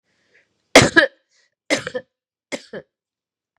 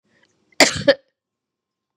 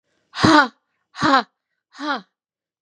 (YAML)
three_cough_length: 3.6 s
three_cough_amplitude: 32768
three_cough_signal_mean_std_ratio: 0.24
cough_length: 2.0 s
cough_amplitude: 32768
cough_signal_mean_std_ratio: 0.24
exhalation_length: 2.8 s
exhalation_amplitude: 31821
exhalation_signal_mean_std_ratio: 0.36
survey_phase: beta (2021-08-13 to 2022-03-07)
age: 45-64
gender: Female
wearing_mask: 'No'
symptom_runny_or_blocked_nose: true
symptom_fatigue: true
symptom_onset: 3 days
smoker_status: Ex-smoker
respiratory_condition_asthma: false
respiratory_condition_other: false
recruitment_source: Test and Trace
submission_delay: 2 days
covid_test_result: Positive
covid_test_method: ePCR